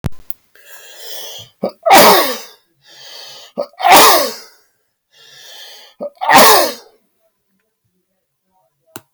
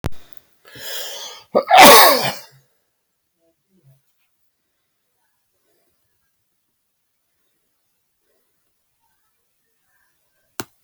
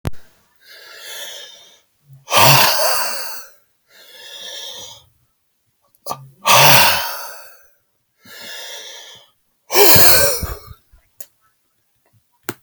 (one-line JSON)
{"three_cough_length": "9.1 s", "three_cough_amplitude": 32768, "three_cough_signal_mean_std_ratio": 0.38, "cough_length": "10.8 s", "cough_amplitude": 32768, "cough_signal_mean_std_ratio": 0.22, "exhalation_length": "12.6 s", "exhalation_amplitude": 32768, "exhalation_signal_mean_std_ratio": 0.39, "survey_phase": "alpha (2021-03-01 to 2021-08-12)", "age": "65+", "gender": "Male", "wearing_mask": "No", "symptom_none": true, "smoker_status": "Ex-smoker", "respiratory_condition_asthma": false, "respiratory_condition_other": false, "recruitment_source": "REACT", "submission_delay": "2 days", "covid_test_result": "Negative", "covid_test_method": "RT-qPCR"}